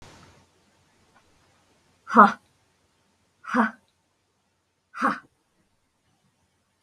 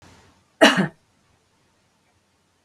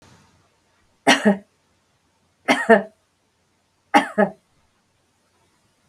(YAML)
exhalation_length: 6.8 s
exhalation_amplitude: 31299
exhalation_signal_mean_std_ratio: 0.2
cough_length: 2.6 s
cough_amplitude: 32768
cough_signal_mean_std_ratio: 0.23
three_cough_length: 5.9 s
three_cough_amplitude: 32768
three_cough_signal_mean_std_ratio: 0.27
survey_phase: beta (2021-08-13 to 2022-03-07)
age: 65+
gender: Female
wearing_mask: 'No'
symptom_none: true
smoker_status: Never smoked
respiratory_condition_asthma: false
respiratory_condition_other: false
recruitment_source: REACT
submission_delay: 2 days
covid_test_result: Negative
covid_test_method: RT-qPCR
influenza_a_test_result: Negative
influenza_b_test_result: Negative